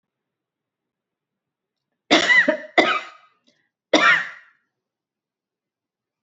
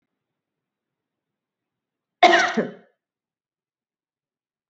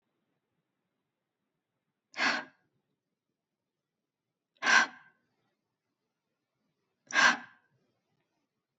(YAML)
three_cough_length: 6.2 s
three_cough_amplitude: 32151
three_cough_signal_mean_std_ratio: 0.31
cough_length: 4.7 s
cough_amplitude: 27207
cough_signal_mean_std_ratio: 0.21
exhalation_length: 8.8 s
exhalation_amplitude: 10777
exhalation_signal_mean_std_ratio: 0.21
survey_phase: beta (2021-08-13 to 2022-03-07)
age: 65+
gender: Female
wearing_mask: 'No'
symptom_none: true
smoker_status: Never smoked
respiratory_condition_asthma: false
respiratory_condition_other: false
recruitment_source: REACT
submission_delay: 1 day
covid_test_result: Negative
covid_test_method: RT-qPCR